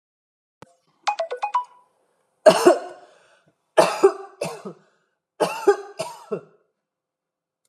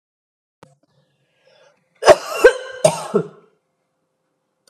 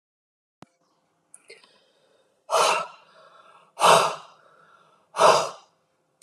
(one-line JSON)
{"three_cough_length": "7.7 s", "three_cough_amplitude": 31191, "three_cough_signal_mean_std_ratio": 0.3, "cough_length": "4.7 s", "cough_amplitude": 32768, "cough_signal_mean_std_ratio": 0.25, "exhalation_length": "6.2 s", "exhalation_amplitude": 24208, "exhalation_signal_mean_std_ratio": 0.31, "survey_phase": "beta (2021-08-13 to 2022-03-07)", "age": "45-64", "gender": "Female", "wearing_mask": "No", "symptom_none": true, "smoker_status": "Ex-smoker", "respiratory_condition_asthma": false, "respiratory_condition_other": false, "recruitment_source": "REACT", "submission_delay": "1 day", "covid_test_result": "Negative", "covid_test_method": "RT-qPCR"}